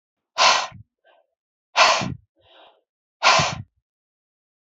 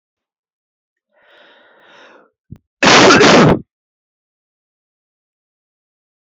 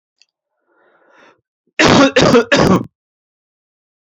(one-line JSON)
{"exhalation_length": "4.8 s", "exhalation_amplitude": 26876, "exhalation_signal_mean_std_ratio": 0.35, "cough_length": "6.3 s", "cough_amplitude": 32768, "cough_signal_mean_std_ratio": 0.3, "three_cough_length": "4.0 s", "three_cough_amplitude": 30893, "three_cough_signal_mean_std_ratio": 0.4, "survey_phase": "beta (2021-08-13 to 2022-03-07)", "age": "45-64", "gender": "Male", "wearing_mask": "No", "symptom_none": true, "smoker_status": "Ex-smoker", "respiratory_condition_asthma": false, "respiratory_condition_other": false, "recruitment_source": "REACT", "submission_delay": "1 day", "covid_test_result": "Negative", "covid_test_method": "RT-qPCR"}